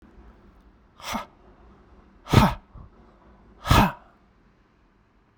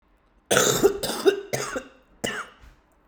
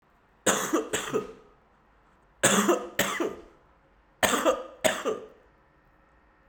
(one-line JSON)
{"exhalation_length": "5.4 s", "exhalation_amplitude": 29131, "exhalation_signal_mean_std_ratio": 0.27, "cough_length": "3.1 s", "cough_amplitude": 29174, "cough_signal_mean_std_ratio": 0.47, "three_cough_length": "6.5 s", "three_cough_amplitude": 16973, "three_cough_signal_mean_std_ratio": 0.46, "survey_phase": "beta (2021-08-13 to 2022-03-07)", "age": "45-64", "gender": "Male", "wearing_mask": "No", "symptom_runny_or_blocked_nose": true, "symptom_onset": "11 days", "smoker_status": "Never smoked", "respiratory_condition_asthma": false, "respiratory_condition_other": false, "recruitment_source": "Test and Trace", "submission_delay": "1 day", "covid_test_result": "Positive", "covid_test_method": "ePCR"}